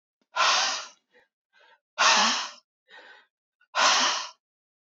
{"exhalation_length": "4.9 s", "exhalation_amplitude": 15027, "exhalation_signal_mean_std_ratio": 0.45, "survey_phase": "beta (2021-08-13 to 2022-03-07)", "age": "18-44", "gender": "Male", "wearing_mask": "No", "symptom_cough_any": true, "symptom_runny_or_blocked_nose": true, "symptom_fatigue": true, "symptom_headache": true, "smoker_status": "Never smoked", "respiratory_condition_asthma": false, "respiratory_condition_other": false, "recruitment_source": "Test and Trace", "submission_delay": "2 days", "covid_test_result": "Positive", "covid_test_method": "RT-qPCR"}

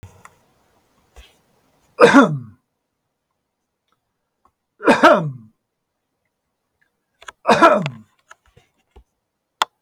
{"three_cough_length": "9.8 s", "three_cough_amplitude": 32768, "three_cough_signal_mean_std_ratio": 0.26, "survey_phase": "beta (2021-08-13 to 2022-03-07)", "age": "65+", "gender": "Male", "wearing_mask": "No", "symptom_none": true, "smoker_status": "Ex-smoker", "respiratory_condition_asthma": false, "respiratory_condition_other": false, "recruitment_source": "REACT", "submission_delay": "2 days", "covid_test_result": "Negative", "covid_test_method": "RT-qPCR", "influenza_a_test_result": "Negative", "influenza_b_test_result": "Negative"}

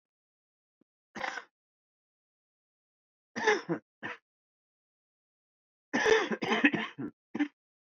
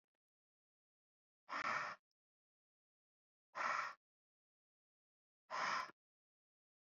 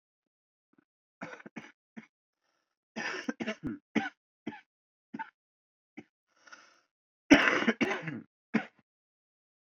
{"three_cough_length": "7.9 s", "three_cough_amplitude": 12121, "three_cough_signal_mean_std_ratio": 0.32, "exhalation_length": "6.9 s", "exhalation_amplitude": 1363, "exhalation_signal_mean_std_ratio": 0.33, "cough_length": "9.6 s", "cough_amplitude": 17671, "cough_signal_mean_std_ratio": 0.26, "survey_phase": "alpha (2021-03-01 to 2021-08-12)", "age": "18-44", "gender": "Male", "wearing_mask": "No", "symptom_cough_any": true, "symptom_shortness_of_breath": true, "symptom_abdominal_pain": true, "symptom_diarrhoea": true, "symptom_fatigue": true, "symptom_fever_high_temperature": true, "symptom_headache": true, "symptom_change_to_sense_of_smell_or_taste": true, "symptom_onset": "3 days", "smoker_status": "Never smoked", "respiratory_condition_asthma": false, "respiratory_condition_other": false, "recruitment_source": "Test and Trace", "submission_delay": "2 days", "covid_test_result": "Positive", "covid_test_method": "RT-qPCR", "covid_ct_value": 14.1, "covid_ct_gene": "ORF1ab gene", "covid_ct_mean": 14.8, "covid_viral_load": "14000000 copies/ml", "covid_viral_load_category": "High viral load (>1M copies/ml)"}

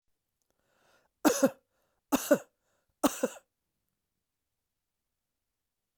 {"three_cough_length": "6.0 s", "three_cough_amplitude": 10725, "three_cough_signal_mean_std_ratio": 0.22, "survey_phase": "alpha (2021-03-01 to 2021-08-12)", "age": "65+", "gender": "Male", "wearing_mask": "No", "symptom_cough_any": true, "symptom_headache": true, "smoker_status": "Never smoked", "respiratory_condition_asthma": false, "respiratory_condition_other": false, "recruitment_source": "Test and Trace", "submission_delay": "2 days", "covid_test_result": "Positive", "covid_test_method": "RT-qPCR"}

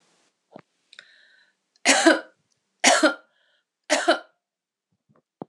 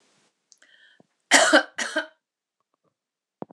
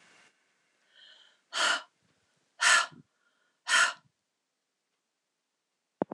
{"three_cough_length": "5.5 s", "three_cough_amplitude": 25282, "three_cough_signal_mean_std_ratio": 0.3, "cough_length": "3.5 s", "cough_amplitude": 25408, "cough_signal_mean_std_ratio": 0.27, "exhalation_length": "6.1 s", "exhalation_amplitude": 11752, "exhalation_signal_mean_std_ratio": 0.28, "survey_phase": "beta (2021-08-13 to 2022-03-07)", "age": "45-64", "gender": "Female", "wearing_mask": "No", "symptom_cough_any": true, "symptom_runny_or_blocked_nose": true, "symptom_onset": "4 days", "smoker_status": "Never smoked", "respiratory_condition_asthma": false, "respiratory_condition_other": false, "recruitment_source": "Test and Trace", "submission_delay": "1 day", "covid_test_result": "Positive", "covid_test_method": "RT-qPCR", "covid_ct_value": 15.9, "covid_ct_gene": "ORF1ab gene"}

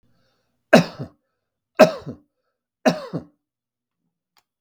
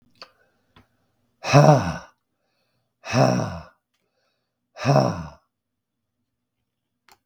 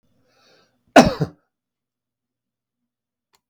{"three_cough_length": "4.6 s", "three_cough_amplitude": 32768, "three_cough_signal_mean_std_ratio": 0.22, "exhalation_length": "7.3 s", "exhalation_amplitude": 32768, "exhalation_signal_mean_std_ratio": 0.29, "cough_length": "3.5 s", "cough_amplitude": 32768, "cough_signal_mean_std_ratio": 0.17, "survey_phase": "beta (2021-08-13 to 2022-03-07)", "age": "65+", "gender": "Male", "wearing_mask": "No", "symptom_none": true, "smoker_status": "Ex-smoker", "respiratory_condition_asthma": false, "respiratory_condition_other": false, "recruitment_source": "REACT", "submission_delay": "1 day", "covid_test_result": "Negative", "covid_test_method": "RT-qPCR"}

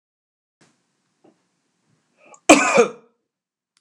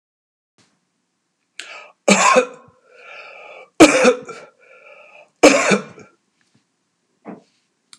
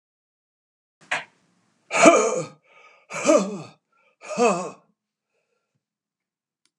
{"cough_length": "3.8 s", "cough_amplitude": 32768, "cough_signal_mean_std_ratio": 0.23, "three_cough_length": "8.0 s", "three_cough_amplitude": 32768, "three_cough_signal_mean_std_ratio": 0.3, "exhalation_length": "6.8 s", "exhalation_amplitude": 30593, "exhalation_signal_mean_std_ratio": 0.32, "survey_phase": "beta (2021-08-13 to 2022-03-07)", "age": "65+", "gender": "Male", "wearing_mask": "No", "symptom_none": true, "smoker_status": "Never smoked", "respiratory_condition_asthma": false, "respiratory_condition_other": false, "recruitment_source": "REACT", "submission_delay": "4 days", "covid_test_result": "Negative", "covid_test_method": "RT-qPCR"}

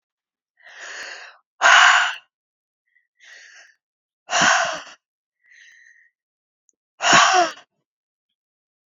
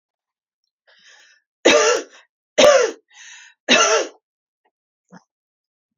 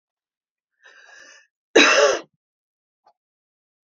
{"exhalation_length": "9.0 s", "exhalation_amplitude": 30108, "exhalation_signal_mean_std_ratio": 0.33, "three_cough_length": "6.0 s", "three_cough_amplitude": 30137, "three_cough_signal_mean_std_ratio": 0.34, "cough_length": "3.8 s", "cough_amplitude": 32432, "cough_signal_mean_std_ratio": 0.27, "survey_phase": "beta (2021-08-13 to 2022-03-07)", "age": "45-64", "gender": "Female", "wearing_mask": "No", "symptom_none": true, "smoker_status": "Never smoked", "respiratory_condition_asthma": false, "respiratory_condition_other": false, "recruitment_source": "REACT", "submission_delay": "2 days", "covid_test_result": "Negative", "covid_test_method": "RT-qPCR"}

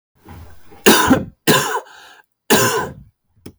{"three_cough_length": "3.6 s", "three_cough_amplitude": 32768, "three_cough_signal_mean_std_ratio": 0.46, "survey_phase": "beta (2021-08-13 to 2022-03-07)", "age": "45-64", "gender": "Male", "wearing_mask": "No", "symptom_cough_any": true, "symptom_fatigue": true, "symptom_fever_high_temperature": true, "symptom_headache": true, "symptom_onset": "2 days", "smoker_status": "Ex-smoker", "respiratory_condition_asthma": false, "respiratory_condition_other": false, "recruitment_source": "Test and Trace", "submission_delay": "1 day", "covid_test_result": "Positive", "covid_test_method": "RT-qPCR", "covid_ct_value": 26.3, "covid_ct_gene": "ORF1ab gene", "covid_ct_mean": 26.9, "covid_viral_load": "1500 copies/ml", "covid_viral_load_category": "Minimal viral load (< 10K copies/ml)"}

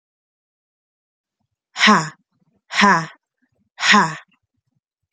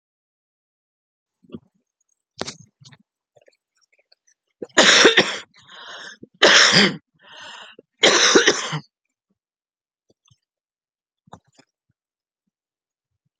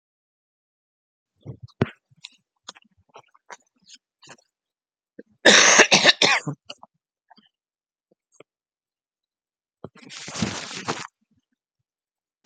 {"exhalation_length": "5.1 s", "exhalation_amplitude": 30961, "exhalation_signal_mean_std_ratio": 0.32, "three_cough_length": "13.4 s", "three_cough_amplitude": 32767, "three_cough_signal_mean_std_ratio": 0.29, "cough_length": "12.5 s", "cough_amplitude": 30789, "cough_signal_mean_std_ratio": 0.23, "survey_phase": "beta (2021-08-13 to 2022-03-07)", "age": "45-64", "gender": "Female", "wearing_mask": "No", "symptom_cough_any": true, "symptom_sore_throat": true, "symptom_change_to_sense_of_smell_or_taste": true, "symptom_onset": "9 days", "smoker_status": "Ex-smoker", "respiratory_condition_asthma": false, "respiratory_condition_other": false, "recruitment_source": "Test and Trace", "submission_delay": "1 day", "covid_test_result": "Positive", "covid_test_method": "RT-qPCR", "covid_ct_value": 32.9, "covid_ct_gene": "N gene", "covid_ct_mean": 34.4, "covid_viral_load": "5.1 copies/ml", "covid_viral_load_category": "Minimal viral load (< 10K copies/ml)"}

